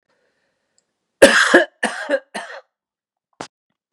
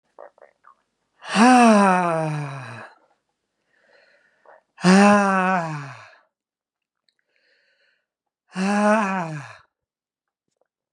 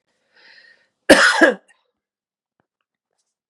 {
  "three_cough_length": "3.9 s",
  "three_cough_amplitude": 32768,
  "three_cough_signal_mean_std_ratio": 0.3,
  "exhalation_length": "10.9 s",
  "exhalation_amplitude": 28941,
  "exhalation_signal_mean_std_ratio": 0.39,
  "cough_length": "3.5 s",
  "cough_amplitude": 32768,
  "cough_signal_mean_std_ratio": 0.27,
  "survey_phase": "beta (2021-08-13 to 2022-03-07)",
  "age": "45-64",
  "gender": "Male",
  "wearing_mask": "No",
  "symptom_none": true,
  "symptom_onset": "12 days",
  "smoker_status": "Never smoked",
  "respiratory_condition_asthma": false,
  "respiratory_condition_other": false,
  "recruitment_source": "REACT",
  "submission_delay": "2 days",
  "covid_test_result": "Negative",
  "covid_test_method": "RT-qPCR"
}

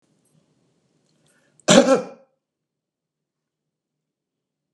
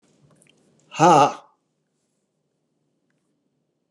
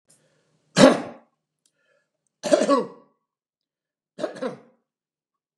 {
  "cough_length": "4.7 s",
  "cough_amplitude": 32767,
  "cough_signal_mean_std_ratio": 0.2,
  "exhalation_length": "3.9 s",
  "exhalation_amplitude": 29429,
  "exhalation_signal_mean_std_ratio": 0.24,
  "three_cough_length": "5.6 s",
  "three_cough_amplitude": 32767,
  "three_cough_signal_mean_std_ratio": 0.25,
  "survey_phase": "beta (2021-08-13 to 2022-03-07)",
  "age": "65+",
  "gender": "Male",
  "wearing_mask": "No",
  "symptom_none": true,
  "smoker_status": "Never smoked",
  "respiratory_condition_asthma": false,
  "respiratory_condition_other": false,
  "recruitment_source": "REACT",
  "submission_delay": "2 days",
  "covid_test_result": "Negative",
  "covid_test_method": "RT-qPCR",
  "influenza_a_test_result": "Negative",
  "influenza_b_test_result": "Negative"
}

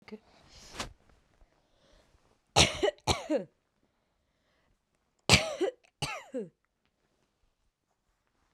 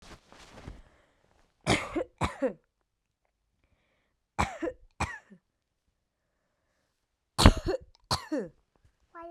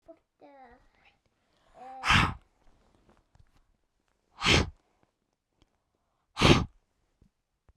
{
  "cough_length": "8.5 s",
  "cough_amplitude": 20198,
  "cough_signal_mean_std_ratio": 0.26,
  "three_cough_length": "9.3 s",
  "three_cough_amplitude": 32768,
  "three_cough_signal_mean_std_ratio": 0.26,
  "exhalation_length": "7.8 s",
  "exhalation_amplitude": 17971,
  "exhalation_signal_mean_std_ratio": 0.25,
  "survey_phase": "beta (2021-08-13 to 2022-03-07)",
  "age": "18-44",
  "gender": "Female",
  "wearing_mask": "No",
  "symptom_cough_any": true,
  "symptom_sore_throat": true,
  "smoker_status": "Never smoked",
  "respiratory_condition_asthma": false,
  "respiratory_condition_other": false,
  "recruitment_source": "REACT",
  "submission_delay": "5 days",
  "covid_test_result": "Negative",
  "covid_test_method": "RT-qPCR"
}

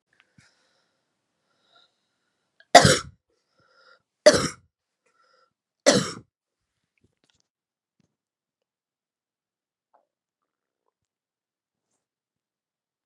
{
  "cough_length": "13.1 s",
  "cough_amplitude": 32768,
  "cough_signal_mean_std_ratio": 0.15,
  "survey_phase": "beta (2021-08-13 to 2022-03-07)",
  "age": "45-64",
  "gender": "Female",
  "wearing_mask": "No",
  "symptom_runny_or_blocked_nose": true,
  "symptom_sore_throat": true,
  "symptom_onset": "4 days",
  "smoker_status": "Never smoked",
  "respiratory_condition_asthma": false,
  "respiratory_condition_other": false,
  "recruitment_source": "Test and Trace",
  "submission_delay": "1 day",
  "covid_test_result": "Positive",
  "covid_test_method": "ePCR"
}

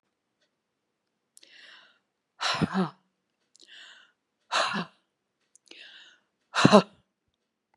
{
  "exhalation_length": "7.8 s",
  "exhalation_amplitude": 28787,
  "exhalation_signal_mean_std_ratio": 0.23,
  "survey_phase": "beta (2021-08-13 to 2022-03-07)",
  "age": "65+",
  "gender": "Female",
  "wearing_mask": "No",
  "symptom_none": true,
  "smoker_status": "Never smoked",
  "respiratory_condition_asthma": false,
  "respiratory_condition_other": false,
  "recruitment_source": "REACT",
  "submission_delay": "2 days",
  "covid_test_result": "Negative",
  "covid_test_method": "RT-qPCR",
  "influenza_a_test_result": "Negative",
  "influenza_b_test_result": "Negative"
}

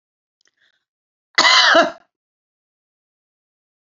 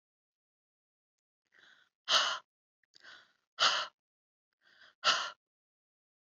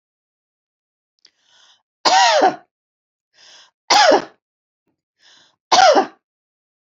{
  "cough_length": "3.8 s",
  "cough_amplitude": 29428,
  "cough_signal_mean_std_ratio": 0.29,
  "exhalation_length": "6.4 s",
  "exhalation_amplitude": 7289,
  "exhalation_signal_mean_std_ratio": 0.27,
  "three_cough_length": "6.9 s",
  "three_cough_amplitude": 30242,
  "three_cough_signal_mean_std_ratio": 0.33,
  "survey_phase": "beta (2021-08-13 to 2022-03-07)",
  "age": "45-64",
  "gender": "Female",
  "wearing_mask": "No",
  "symptom_none": true,
  "smoker_status": "Never smoked",
  "respiratory_condition_asthma": false,
  "respiratory_condition_other": false,
  "recruitment_source": "REACT",
  "submission_delay": "2 days",
  "covid_test_result": "Negative",
  "covid_test_method": "RT-qPCR",
  "influenza_a_test_result": "Negative",
  "influenza_b_test_result": "Negative"
}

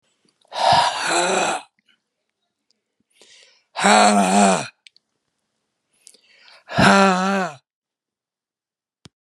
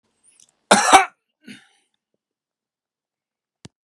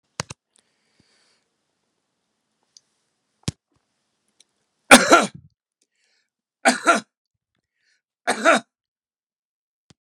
{
  "exhalation_length": "9.2 s",
  "exhalation_amplitude": 32767,
  "exhalation_signal_mean_std_ratio": 0.41,
  "cough_length": "3.8 s",
  "cough_amplitude": 32768,
  "cough_signal_mean_std_ratio": 0.22,
  "three_cough_length": "10.1 s",
  "three_cough_amplitude": 32768,
  "three_cough_signal_mean_std_ratio": 0.2,
  "survey_phase": "beta (2021-08-13 to 2022-03-07)",
  "age": "65+",
  "gender": "Male",
  "wearing_mask": "No",
  "symptom_none": true,
  "smoker_status": "Ex-smoker",
  "respiratory_condition_asthma": false,
  "respiratory_condition_other": false,
  "recruitment_source": "REACT",
  "submission_delay": "2 days",
  "covid_test_result": "Negative",
  "covid_test_method": "RT-qPCR"
}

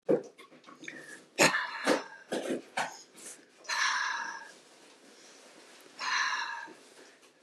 {
  "exhalation_length": "7.4 s",
  "exhalation_amplitude": 13372,
  "exhalation_signal_mean_std_ratio": 0.49,
  "survey_phase": "beta (2021-08-13 to 2022-03-07)",
  "age": "65+",
  "gender": "Female",
  "wearing_mask": "No",
  "symptom_shortness_of_breath": true,
  "smoker_status": "Never smoked",
  "respiratory_condition_asthma": true,
  "respiratory_condition_other": false,
  "recruitment_source": "REACT",
  "submission_delay": "1 day",
  "covid_test_result": "Negative",
  "covid_test_method": "RT-qPCR",
  "influenza_a_test_result": "Negative",
  "influenza_b_test_result": "Negative"
}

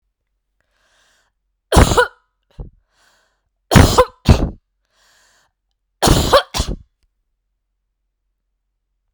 {
  "three_cough_length": "9.1 s",
  "three_cough_amplitude": 32768,
  "three_cough_signal_mean_std_ratio": 0.29,
  "survey_phase": "beta (2021-08-13 to 2022-03-07)",
  "age": "45-64",
  "gender": "Female",
  "wearing_mask": "No",
  "symptom_cough_any": true,
  "symptom_runny_or_blocked_nose": true,
  "symptom_fatigue": true,
  "symptom_headache": true,
  "symptom_other": true,
  "smoker_status": "Never smoked",
  "respiratory_condition_asthma": false,
  "respiratory_condition_other": false,
  "recruitment_source": "Test and Trace",
  "submission_delay": "2 days",
  "covid_test_result": "Positive",
  "covid_test_method": "RT-qPCR",
  "covid_ct_value": 23.6,
  "covid_ct_gene": "N gene"
}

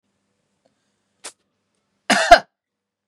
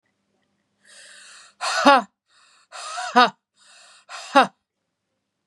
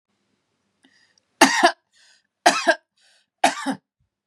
{
  "cough_length": "3.1 s",
  "cough_amplitude": 32768,
  "cough_signal_mean_std_ratio": 0.19,
  "exhalation_length": "5.5 s",
  "exhalation_amplitude": 30895,
  "exhalation_signal_mean_std_ratio": 0.27,
  "three_cough_length": "4.3 s",
  "three_cough_amplitude": 32768,
  "three_cough_signal_mean_std_ratio": 0.29,
  "survey_phase": "beta (2021-08-13 to 2022-03-07)",
  "age": "45-64",
  "gender": "Female",
  "wearing_mask": "No",
  "symptom_none": true,
  "smoker_status": "Never smoked",
  "respiratory_condition_asthma": false,
  "respiratory_condition_other": false,
  "recruitment_source": "REACT",
  "submission_delay": "9 days",
  "covid_test_result": "Negative",
  "covid_test_method": "RT-qPCR",
  "influenza_a_test_result": "Negative",
  "influenza_b_test_result": "Negative"
}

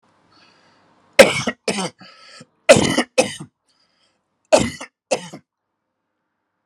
{
  "three_cough_length": "6.7 s",
  "three_cough_amplitude": 32768,
  "three_cough_signal_mean_std_ratio": 0.27,
  "survey_phase": "alpha (2021-03-01 to 2021-08-12)",
  "age": "45-64",
  "gender": "Male",
  "wearing_mask": "No",
  "symptom_cough_any": true,
  "symptom_fatigue": true,
  "symptom_change_to_sense_of_smell_or_taste": true,
  "symptom_onset": "7 days",
  "smoker_status": "Never smoked",
  "respiratory_condition_asthma": false,
  "respiratory_condition_other": false,
  "recruitment_source": "Test and Trace",
  "submission_delay": "3 days",
  "covid_test_result": "Positive",
  "covid_test_method": "RT-qPCR",
  "covid_ct_value": 14.1,
  "covid_ct_gene": "ORF1ab gene",
  "covid_ct_mean": 14.4,
  "covid_viral_load": "19000000 copies/ml",
  "covid_viral_load_category": "High viral load (>1M copies/ml)"
}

